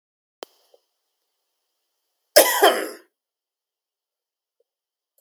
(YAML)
cough_length: 5.2 s
cough_amplitude: 32767
cough_signal_mean_std_ratio: 0.21
survey_phase: beta (2021-08-13 to 2022-03-07)
age: 45-64
gender: Male
wearing_mask: 'No'
symptom_other: true
symptom_onset: 5 days
smoker_status: Never smoked
respiratory_condition_asthma: false
respiratory_condition_other: false
recruitment_source: REACT
submission_delay: 1 day
covid_test_result: Negative
covid_test_method: RT-qPCR
influenza_a_test_result: Negative
influenza_b_test_result: Negative